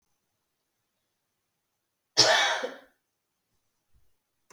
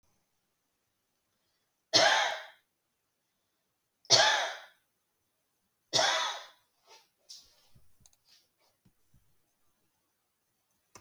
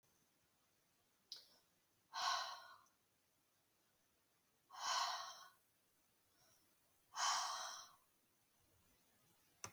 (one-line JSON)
{"cough_length": "4.5 s", "cough_amplitude": 19050, "cough_signal_mean_std_ratio": 0.25, "three_cough_length": "11.0 s", "three_cough_amplitude": 13380, "three_cough_signal_mean_std_ratio": 0.27, "exhalation_length": "9.7 s", "exhalation_amplitude": 1341, "exhalation_signal_mean_std_ratio": 0.36, "survey_phase": "beta (2021-08-13 to 2022-03-07)", "age": "65+", "gender": "Female", "wearing_mask": "No", "symptom_runny_or_blocked_nose": true, "smoker_status": "Never smoked", "respiratory_condition_asthma": false, "respiratory_condition_other": false, "recruitment_source": "REACT", "submission_delay": "2 days", "covid_test_result": "Negative", "covid_test_method": "RT-qPCR", "influenza_a_test_result": "Negative", "influenza_b_test_result": "Negative"}